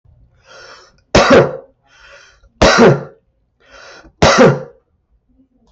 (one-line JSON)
{"three_cough_length": "5.7 s", "three_cough_amplitude": 32768, "three_cough_signal_mean_std_ratio": 0.39, "survey_phase": "beta (2021-08-13 to 2022-03-07)", "age": "65+", "gender": "Male", "wearing_mask": "No", "symptom_runny_or_blocked_nose": true, "smoker_status": "Never smoked", "respiratory_condition_asthma": false, "respiratory_condition_other": false, "recruitment_source": "REACT", "submission_delay": "2 days", "covid_test_result": "Negative", "covid_test_method": "RT-qPCR", "influenza_a_test_result": "Negative", "influenza_b_test_result": "Negative"}